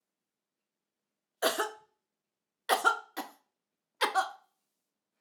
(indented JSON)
{
  "three_cough_length": "5.2 s",
  "three_cough_amplitude": 8189,
  "three_cough_signal_mean_std_ratio": 0.29,
  "survey_phase": "alpha (2021-03-01 to 2021-08-12)",
  "age": "65+",
  "gender": "Female",
  "wearing_mask": "No",
  "symptom_none": true,
  "smoker_status": "Never smoked",
  "respiratory_condition_asthma": false,
  "respiratory_condition_other": false,
  "recruitment_source": "REACT",
  "submission_delay": "1 day",
  "covid_test_result": "Negative",
  "covid_test_method": "RT-qPCR"
}